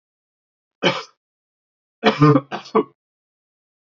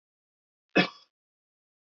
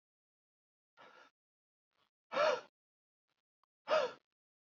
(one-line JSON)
{"three_cough_length": "3.9 s", "three_cough_amplitude": 31231, "three_cough_signal_mean_std_ratio": 0.29, "cough_length": "1.9 s", "cough_amplitude": 12361, "cough_signal_mean_std_ratio": 0.18, "exhalation_length": "4.7 s", "exhalation_amplitude": 3125, "exhalation_signal_mean_std_ratio": 0.26, "survey_phase": "beta (2021-08-13 to 2022-03-07)", "age": "18-44", "gender": "Male", "wearing_mask": "No", "symptom_runny_or_blocked_nose": true, "symptom_diarrhoea": true, "symptom_fatigue": true, "symptom_onset": "9 days", "smoker_status": "Never smoked", "respiratory_condition_asthma": false, "respiratory_condition_other": false, "recruitment_source": "REACT", "submission_delay": "7 days", "covid_test_result": "Negative", "covid_test_method": "RT-qPCR", "influenza_a_test_result": "Negative", "influenza_b_test_result": "Negative"}